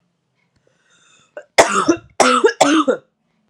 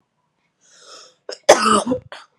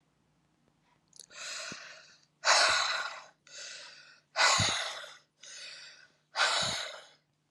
{"three_cough_length": "3.5 s", "three_cough_amplitude": 32768, "three_cough_signal_mean_std_ratio": 0.42, "cough_length": "2.4 s", "cough_amplitude": 32768, "cough_signal_mean_std_ratio": 0.33, "exhalation_length": "7.5 s", "exhalation_amplitude": 8765, "exhalation_signal_mean_std_ratio": 0.44, "survey_phase": "beta (2021-08-13 to 2022-03-07)", "age": "18-44", "gender": "Female", "wearing_mask": "Prefer not to say", "symptom_none": true, "smoker_status": "Never smoked", "respiratory_condition_asthma": true, "respiratory_condition_other": false, "recruitment_source": "Test and Trace", "submission_delay": "0 days", "covid_test_result": "Negative", "covid_test_method": "RT-qPCR"}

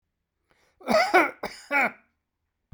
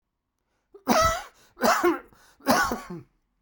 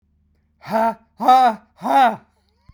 {"cough_length": "2.7 s", "cough_amplitude": 17360, "cough_signal_mean_std_ratio": 0.39, "three_cough_length": "3.4 s", "three_cough_amplitude": 18670, "three_cough_signal_mean_std_ratio": 0.46, "exhalation_length": "2.7 s", "exhalation_amplitude": 23619, "exhalation_signal_mean_std_ratio": 0.48, "survey_phase": "beta (2021-08-13 to 2022-03-07)", "age": "45-64", "gender": "Male", "wearing_mask": "No", "symptom_cough_any": true, "symptom_runny_or_blocked_nose": true, "symptom_shortness_of_breath": true, "symptom_abdominal_pain": true, "symptom_fatigue": true, "symptom_fever_high_temperature": true, "symptom_headache": true, "symptom_change_to_sense_of_smell_or_taste": true, "symptom_loss_of_taste": true, "symptom_onset": "3 days", "smoker_status": "Ex-smoker", "respiratory_condition_asthma": false, "respiratory_condition_other": false, "recruitment_source": "Test and Trace", "submission_delay": "2 days", "covid_test_result": "Positive", "covid_test_method": "RT-qPCR", "covid_ct_value": 16.7, "covid_ct_gene": "ORF1ab gene", "covid_ct_mean": 17.8, "covid_viral_load": "1400000 copies/ml", "covid_viral_load_category": "High viral load (>1M copies/ml)"}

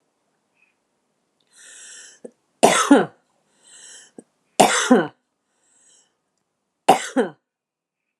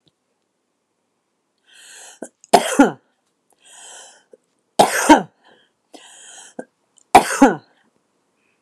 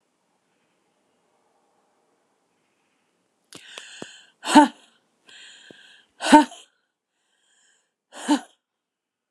{"three_cough_length": "8.2 s", "three_cough_amplitude": 29204, "three_cough_signal_mean_std_ratio": 0.27, "cough_length": "8.6 s", "cough_amplitude": 29204, "cough_signal_mean_std_ratio": 0.25, "exhalation_length": "9.3 s", "exhalation_amplitude": 29203, "exhalation_signal_mean_std_ratio": 0.18, "survey_phase": "beta (2021-08-13 to 2022-03-07)", "age": "65+", "gender": "Female", "wearing_mask": "No", "symptom_none": true, "smoker_status": "Never smoked", "respiratory_condition_asthma": false, "respiratory_condition_other": false, "recruitment_source": "REACT", "submission_delay": "3 days", "covid_test_result": "Negative", "covid_test_method": "RT-qPCR"}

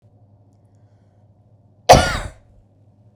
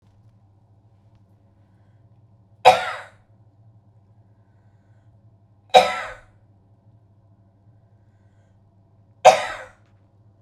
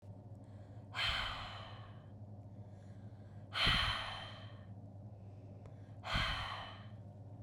{"cough_length": "3.2 s", "cough_amplitude": 32768, "cough_signal_mean_std_ratio": 0.22, "three_cough_length": "10.4 s", "three_cough_amplitude": 32768, "three_cough_signal_mean_std_ratio": 0.19, "exhalation_length": "7.4 s", "exhalation_amplitude": 3443, "exhalation_signal_mean_std_ratio": 0.66, "survey_phase": "beta (2021-08-13 to 2022-03-07)", "age": "18-44", "gender": "Female", "wearing_mask": "No", "symptom_none": true, "smoker_status": "Never smoked", "respiratory_condition_asthma": false, "respiratory_condition_other": false, "recruitment_source": "REACT", "submission_delay": "0 days", "covid_test_result": "Negative", "covid_test_method": "RT-qPCR", "influenza_a_test_result": "Negative", "influenza_b_test_result": "Negative"}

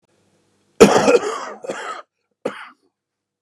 {"cough_length": "3.4 s", "cough_amplitude": 32768, "cough_signal_mean_std_ratio": 0.33, "survey_phase": "beta (2021-08-13 to 2022-03-07)", "age": "45-64", "gender": "Male", "wearing_mask": "No", "symptom_cough_any": true, "symptom_runny_or_blocked_nose": true, "symptom_shortness_of_breath": true, "symptom_sore_throat": true, "symptom_abdominal_pain": true, "symptom_diarrhoea": true, "symptom_fatigue": true, "symptom_headache": true, "symptom_loss_of_taste": true, "symptom_other": true, "smoker_status": "Ex-smoker", "respiratory_condition_asthma": true, "respiratory_condition_other": false, "recruitment_source": "Test and Trace", "submission_delay": "3 days", "covid_test_result": "Positive", "covid_test_method": "LFT"}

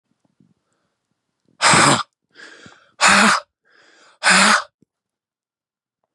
{"exhalation_length": "6.1 s", "exhalation_amplitude": 31640, "exhalation_signal_mean_std_ratio": 0.36, "survey_phase": "beta (2021-08-13 to 2022-03-07)", "age": "45-64", "gender": "Male", "wearing_mask": "No", "symptom_none": true, "smoker_status": "Never smoked", "respiratory_condition_asthma": false, "respiratory_condition_other": false, "recruitment_source": "REACT", "submission_delay": "2 days", "covid_test_result": "Negative", "covid_test_method": "RT-qPCR", "influenza_a_test_result": "Negative", "influenza_b_test_result": "Negative"}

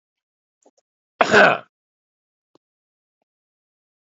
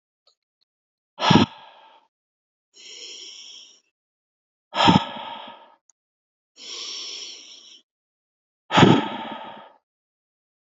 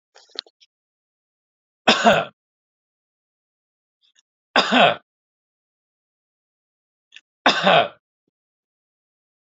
{"cough_length": "4.0 s", "cough_amplitude": 28852, "cough_signal_mean_std_ratio": 0.21, "exhalation_length": "10.8 s", "exhalation_amplitude": 29567, "exhalation_signal_mean_std_ratio": 0.27, "three_cough_length": "9.5 s", "three_cough_amplitude": 30010, "three_cough_signal_mean_std_ratio": 0.26, "survey_phase": "beta (2021-08-13 to 2022-03-07)", "age": "45-64", "gender": "Male", "wearing_mask": "No", "symptom_none": true, "smoker_status": "Ex-smoker", "respiratory_condition_asthma": false, "respiratory_condition_other": false, "recruitment_source": "REACT", "submission_delay": "1 day", "covid_test_result": "Negative", "covid_test_method": "RT-qPCR", "influenza_a_test_result": "Unknown/Void", "influenza_b_test_result": "Unknown/Void"}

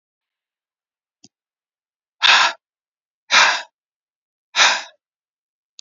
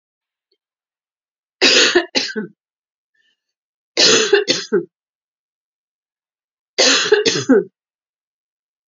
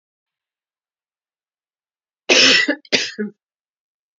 {"exhalation_length": "5.8 s", "exhalation_amplitude": 30717, "exhalation_signal_mean_std_ratio": 0.29, "three_cough_length": "8.9 s", "three_cough_amplitude": 32768, "three_cough_signal_mean_std_ratio": 0.38, "cough_length": "4.2 s", "cough_amplitude": 31350, "cough_signal_mean_std_ratio": 0.31, "survey_phase": "alpha (2021-03-01 to 2021-08-12)", "age": "65+", "gender": "Female", "wearing_mask": "No", "symptom_none": true, "smoker_status": "Ex-smoker", "respiratory_condition_asthma": false, "respiratory_condition_other": false, "recruitment_source": "REACT", "submission_delay": "1 day", "covid_test_result": "Negative", "covid_test_method": "RT-qPCR"}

